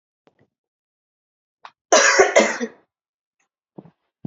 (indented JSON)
{
  "cough_length": "4.3 s",
  "cough_amplitude": 30314,
  "cough_signal_mean_std_ratio": 0.3,
  "survey_phase": "alpha (2021-03-01 to 2021-08-12)",
  "age": "18-44",
  "gender": "Female",
  "wearing_mask": "No",
  "symptom_fatigue": true,
  "smoker_status": "Ex-smoker",
  "respiratory_condition_asthma": false,
  "respiratory_condition_other": false,
  "recruitment_source": "Test and Trace",
  "submission_delay": "2 days",
  "covid_test_result": "Positive",
  "covid_test_method": "RT-qPCR",
  "covid_ct_value": 22.9,
  "covid_ct_gene": "ORF1ab gene"
}